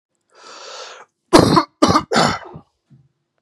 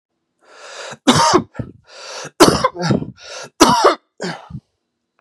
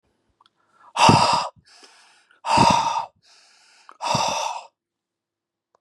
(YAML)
cough_length: 3.4 s
cough_amplitude: 32768
cough_signal_mean_std_ratio: 0.38
three_cough_length: 5.2 s
three_cough_amplitude: 32768
three_cough_signal_mean_std_ratio: 0.42
exhalation_length: 5.8 s
exhalation_amplitude: 31587
exhalation_signal_mean_std_ratio: 0.41
survey_phase: beta (2021-08-13 to 2022-03-07)
age: 45-64
gender: Male
wearing_mask: 'No'
symptom_none: true
symptom_onset: 7 days
smoker_status: Never smoked
respiratory_condition_asthma: false
respiratory_condition_other: false
recruitment_source: REACT
submission_delay: 1 day
covid_test_result: Negative
covid_test_method: RT-qPCR
influenza_a_test_result: Negative
influenza_b_test_result: Negative